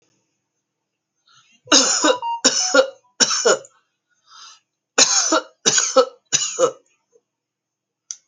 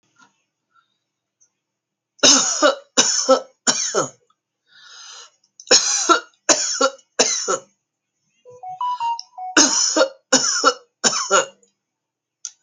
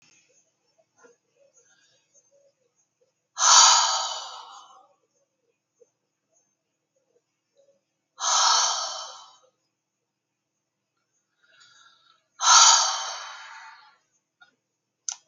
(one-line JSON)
{"cough_length": "8.3 s", "cough_amplitude": 32768, "cough_signal_mean_std_ratio": 0.42, "three_cough_length": "12.6 s", "three_cough_amplitude": 32768, "three_cough_signal_mean_std_ratio": 0.45, "exhalation_length": "15.3 s", "exhalation_amplitude": 25125, "exhalation_signal_mean_std_ratio": 0.29, "survey_phase": "alpha (2021-03-01 to 2021-08-12)", "age": "65+", "gender": "Female", "wearing_mask": "No", "symptom_new_continuous_cough": true, "symptom_fatigue": true, "symptom_headache": true, "smoker_status": "Ex-smoker", "respiratory_condition_asthma": false, "respiratory_condition_other": false, "recruitment_source": "Test and Trace", "submission_delay": "3 days", "covid_test_method": "RT-qPCR"}